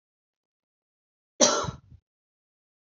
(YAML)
cough_length: 3.0 s
cough_amplitude: 24659
cough_signal_mean_std_ratio: 0.22
survey_phase: alpha (2021-03-01 to 2021-08-12)
age: 18-44
gender: Female
wearing_mask: 'No'
symptom_none: true
smoker_status: Never smoked
respiratory_condition_asthma: false
respiratory_condition_other: false
recruitment_source: REACT
submission_delay: 1 day
covid_test_result: Negative
covid_test_method: RT-qPCR